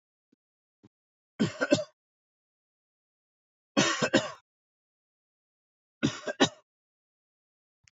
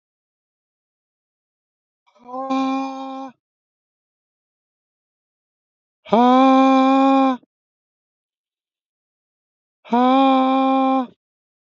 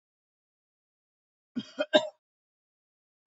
{"three_cough_length": "7.9 s", "three_cough_amplitude": 12308, "three_cough_signal_mean_std_ratio": 0.26, "exhalation_length": "11.8 s", "exhalation_amplitude": 25501, "exhalation_signal_mean_std_ratio": 0.4, "cough_length": "3.3 s", "cough_amplitude": 14874, "cough_signal_mean_std_ratio": 0.17, "survey_phase": "beta (2021-08-13 to 2022-03-07)", "age": "45-64", "gender": "Male", "wearing_mask": "No", "symptom_none": true, "symptom_onset": "12 days", "smoker_status": "Never smoked", "respiratory_condition_asthma": false, "respiratory_condition_other": false, "recruitment_source": "REACT", "submission_delay": "2 days", "covid_test_result": "Negative", "covid_test_method": "RT-qPCR", "influenza_a_test_result": "Negative", "influenza_b_test_result": "Negative"}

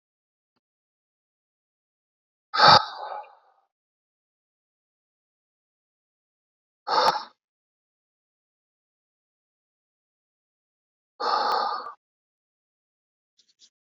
{"exhalation_length": "13.8 s", "exhalation_amplitude": 26003, "exhalation_signal_mean_std_ratio": 0.21, "survey_phase": "beta (2021-08-13 to 2022-03-07)", "age": "45-64", "gender": "Male", "wearing_mask": "No", "symptom_cough_any": true, "symptom_runny_or_blocked_nose": true, "symptom_sore_throat": true, "symptom_abdominal_pain": true, "symptom_diarrhoea": true, "symptom_fatigue": true, "symptom_headache": true, "smoker_status": "Never smoked", "respiratory_condition_asthma": false, "respiratory_condition_other": false, "recruitment_source": "Test and Trace", "submission_delay": "2 days", "covid_test_result": "Positive", "covid_test_method": "RT-qPCR"}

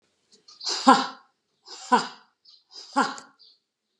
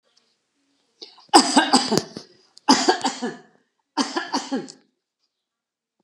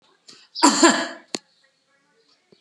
{"exhalation_length": "4.0 s", "exhalation_amplitude": 30657, "exhalation_signal_mean_std_ratio": 0.3, "three_cough_length": "6.0 s", "three_cough_amplitude": 32768, "three_cough_signal_mean_std_ratio": 0.35, "cough_length": "2.6 s", "cough_amplitude": 30713, "cough_signal_mean_std_ratio": 0.32, "survey_phase": "alpha (2021-03-01 to 2021-08-12)", "age": "65+", "gender": "Female", "wearing_mask": "No", "symptom_none": true, "smoker_status": "Never smoked", "respiratory_condition_asthma": false, "respiratory_condition_other": false, "recruitment_source": "REACT", "submission_delay": "2 days", "covid_test_result": "Negative", "covid_test_method": "RT-qPCR"}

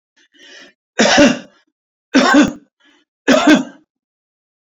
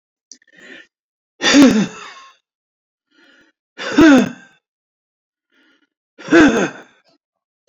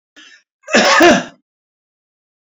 {"three_cough_length": "4.8 s", "three_cough_amplitude": 31530, "three_cough_signal_mean_std_ratio": 0.41, "exhalation_length": "7.7 s", "exhalation_amplitude": 29028, "exhalation_signal_mean_std_ratio": 0.33, "cough_length": "2.5 s", "cough_amplitude": 30535, "cough_signal_mean_std_ratio": 0.39, "survey_phase": "beta (2021-08-13 to 2022-03-07)", "age": "65+", "gender": "Male", "wearing_mask": "No", "symptom_none": true, "smoker_status": "Never smoked", "respiratory_condition_asthma": false, "respiratory_condition_other": false, "recruitment_source": "REACT", "submission_delay": "0 days", "covid_test_result": "Negative", "covid_test_method": "RT-qPCR"}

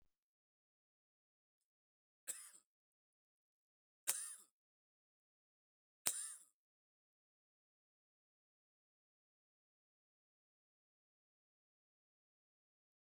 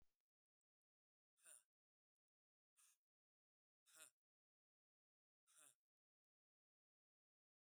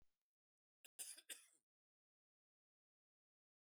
{"three_cough_length": "13.1 s", "three_cough_amplitude": 11734, "three_cough_signal_mean_std_ratio": 0.14, "exhalation_length": "7.7 s", "exhalation_amplitude": 122, "exhalation_signal_mean_std_ratio": 0.23, "cough_length": "3.8 s", "cough_amplitude": 405, "cough_signal_mean_std_ratio": 0.23, "survey_phase": "beta (2021-08-13 to 2022-03-07)", "age": "45-64", "gender": "Male", "wearing_mask": "No", "symptom_none": true, "smoker_status": "Never smoked", "respiratory_condition_asthma": false, "respiratory_condition_other": false, "recruitment_source": "Test and Trace", "submission_delay": "1 day", "covid_test_result": "Negative", "covid_test_method": "RT-qPCR"}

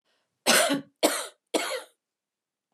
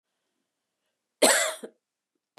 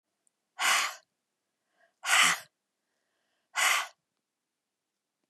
{"three_cough_length": "2.7 s", "three_cough_amplitude": 15758, "three_cough_signal_mean_std_ratio": 0.41, "cough_length": "2.4 s", "cough_amplitude": 17691, "cough_signal_mean_std_ratio": 0.28, "exhalation_length": "5.3 s", "exhalation_amplitude": 10730, "exhalation_signal_mean_std_ratio": 0.33, "survey_phase": "beta (2021-08-13 to 2022-03-07)", "age": "45-64", "gender": "Female", "wearing_mask": "No", "symptom_none": true, "smoker_status": "Never smoked", "respiratory_condition_asthma": false, "respiratory_condition_other": false, "recruitment_source": "REACT", "submission_delay": "1 day", "covid_test_result": "Negative", "covid_test_method": "RT-qPCR", "influenza_a_test_result": "Unknown/Void", "influenza_b_test_result": "Unknown/Void"}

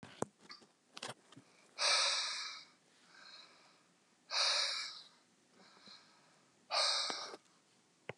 {"exhalation_length": "8.2 s", "exhalation_amplitude": 3992, "exhalation_signal_mean_std_ratio": 0.44, "survey_phase": "beta (2021-08-13 to 2022-03-07)", "age": "45-64", "gender": "Male", "wearing_mask": "No", "symptom_none": true, "smoker_status": "Never smoked", "respiratory_condition_asthma": false, "respiratory_condition_other": false, "recruitment_source": "REACT", "submission_delay": "11 days", "covid_test_result": "Negative", "covid_test_method": "RT-qPCR", "influenza_a_test_result": "Negative", "influenza_b_test_result": "Negative"}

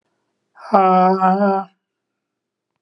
{"exhalation_length": "2.8 s", "exhalation_amplitude": 31029, "exhalation_signal_mean_std_ratio": 0.5, "survey_phase": "beta (2021-08-13 to 2022-03-07)", "age": "65+", "gender": "Male", "wearing_mask": "No", "symptom_none": true, "smoker_status": "Ex-smoker", "respiratory_condition_asthma": false, "respiratory_condition_other": false, "recruitment_source": "REACT", "submission_delay": "3 days", "covid_test_result": "Negative", "covid_test_method": "RT-qPCR"}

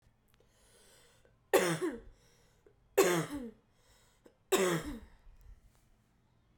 {"three_cough_length": "6.6 s", "three_cough_amplitude": 7268, "three_cough_signal_mean_std_ratio": 0.35, "survey_phase": "beta (2021-08-13 to 2022-03-07)", "age": "18-44", "gender": "Female", "wearing_mask": "No", "symptom_cough_any": true, "symptom_runny_or_blocked_nose": true, "symptom_sore_throat": true, "symptom_fatigue": true, "symptom_fever_high_temperature": true, "symptom_change_to_sense_of_smell_or_taste": true, "symptom_loss_of_taste": true, "symptom_onset": "2 days", "smoker_status": "Never smoked", "respiratory_condition_asthma": true, "respiratory_condition_other": false, "recruitment_source": "Test and Trace", "submission_delay": "1 day", "covid_test_result": "Positive", "covid_test_method": "RT-qPCR", "covid_ct_value": 14.7, "covid_ct_gene": "ORF1ab gene", "covid_ct_mean": 15.0, "covid_viral_load": "12000000 copies/ml", "covid_viral_load_category": "High viral load (>1M copies/ml)"}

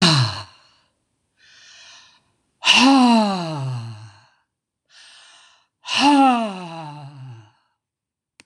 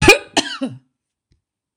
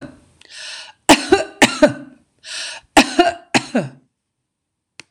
{"exhalation_length": "8.5 s", "exhalation_amplitude": 26028, "exhalation_signal_mean_std_ratio": 0.42, "cough_length": "1.8 s", "cough_amplitude": 26028, "cough_signal_mean_std_ratio": 0.32, "three_cough_length": "5.1 s", "three_cough_amplitude": 26028, "three_cough_signal_mean_std_ratio": 0.35, "survey_phase": "beta (2021-08-13 to 2022-03-07)", "age": "65+", "gender": "Female", "wearing_mask": "No", "symptom_runny_or_blocked_nose": true, "smoker_status": "Never smoked", "respiratory_condition_asthma": false, "respiratory_condition_other": false, "recruitment_source": "REACT", "submission_delay": "2 days", "covid_test_result": "Negative", "covid_test_method": "RT-qPCR", "influenza_a_test_result": "Negative", "influenza_b_test_result": "Negative"}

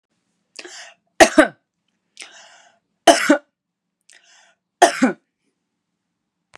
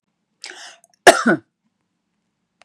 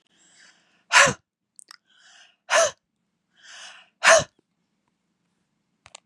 {"three_cough_length": "6.6 s", "three_cough_amplitude": 32768, "three_cough_signal_mean_std_ratio": 0.24, "cough_length": "2.6 s", "cough_amplitude": 32768, "cough_signal_mean_std_ratio": 0.22, "exhalation_length": "6.1 s", "exhalation_amplitude": 29587, "exhalation_signal_mean_std_ratio": 0.25, "survey_phase": "beta (2021-08-13 to 2022-03-07)", "age": "45-64", "gender": "Female", "wearing_mask": "No", "symptom_none": true, "smoker_status": "Never smoked", "respiratory_condition_asthma": false, "respiratory_condition_other": false, "recruitment_source": "REACT", "submission_delay": "1 day", "covid_test_result": "Negative", "covid_test_method": "RT-qPCR", "influenza_a_test_result": "Negative", "influenza_b_test_result": "Negative"}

